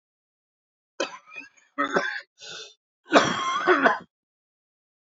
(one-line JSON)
{"cough_length": "5.1 s", "cough_amplitude": 23967, "cough_signal_mean_std_ratio": 0.38, "survey_phase": "alpha (2021-03-01 to 2021-08-12)", "age": "18-44", "gender": "Male", "wearing_mask": "No", "symptom_cough_any": true, "symptom_onset": "8 days", "smoker_status": "Never smoked", "respiratory_condition_asthma": false, "respiratory_condition_other": true, "recruitment_source": "REACT", "submission_delay": "1 day", "covid_test_result": "Negative", "covid_test_method": "RT-qPCR"}